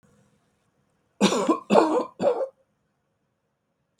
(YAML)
cough_length: 4.0 s
cough_amplitude: 23821
cough_signal_mean_std_ratio: 0.38
survey_phase: beta (2021-08-13 to 2022-03-07)
age: 65+
gender: Male
wearing_mask: 'No'
symptom_none: true
smoker_status: Never smoked
respiratory_condition_asthma: false
respiratory_condition_other: false
recruitment_source: REACT
submission_delay: 2 days
covid_test_result: Negative
covid_test_method: RT-qPCR
influenza_a_test_result: Negative
influenza_b_test_result: Negative